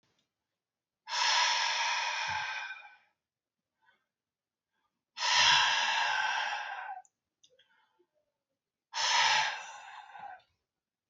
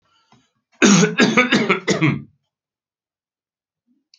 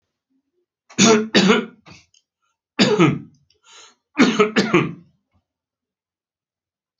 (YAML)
exhalation_length: 11.1 s
exhalation_amplitude: 7303
exhalation_signal_mean_std_ratio: 0.5
cough_length: 4.2 s
cough_amplitude: 29287
cough_signal_mean_std_ratio: 0.42
three_cough_length: 7.0 s
three_cough_amplitude: 32767
three_cough_signal_mean_std_ratio: 0.38
survey_phase: beta (2021-08-13 to 2022-03-07)
age: 45-64
gender: Male
wearing_mask: 'No'
symptom_none: true
smoker_status: Never smoked
respiratory_condition_asthma: false
respiratory_condition_other: false
recruitment_source: REACT
submission_delay: 7 days
covid_test_result: Negative
covid_test_method: RT-qPCR
influenza_a_test_result: Negative
influenza_b_test_result: Negative